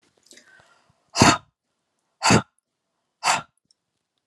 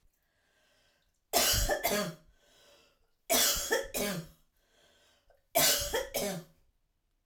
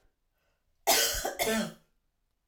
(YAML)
exhalation_length: 4.3 s
exhalation_amplitude: 32515
exhalation_signal_mean_std_ratio: 0.27
three_cough_length: 7.3 s
three_cough_amplitude: 7523
three_cough_signal_mean_std_ratio: 0.47
cough_length: 2.5 s
cough_amplitude: 9183
cough_signal_mean_std_ratio: 0.45
survey_phase: alpha (2021-03-01 to 2021-08-12)
age: 45-64
gender: Female
wearing_mask: 'No'
symptom_none: true
smoker_status: Ex-smoker
respiratory_condition_asthma: false
respiratory_condition_other: false
recruitment_source: REACT
submission_delay: 1 day
covid_test_result: Negative
covid_test_method: RT-qPCR